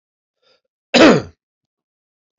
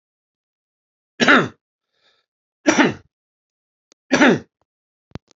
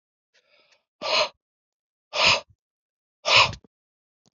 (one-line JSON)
{"cough_length": "2.4 s", "cough_amplitude": 29465, "cough_signal_mean_std_ratio": 0.27, "three_cough_length": "5.4 s", "three_cough_amplitude": 32767, "three_cough_signal_mean_std_ratio": 0.29, "exhalation_length": "4.4 s", "exhalation_amplitude": 25083, "exhalation_signal_mean_std_ratio": 0.31, "survey_phase": "alpha (2021-03-01 to 2021-08-12)", "age": "45-64", "gender": "Male", "wearing_mask": "No", "symptom_cough_any": true, "symptom_fatigue": true, "symptom_onset": "6 days", "smoker_status": "Ex-smoker", "respiratory_condition_asthma": false, "respiratory_condition_other": false, "recruitment_source": "Test and Trace", "submission_delay": "3 days", "covid_test_result": "Positive", "covid_test_method": "RT-qPCR", "covid_ct_value": 26.7, "covid_ct_gene": "ORF1ab gene"}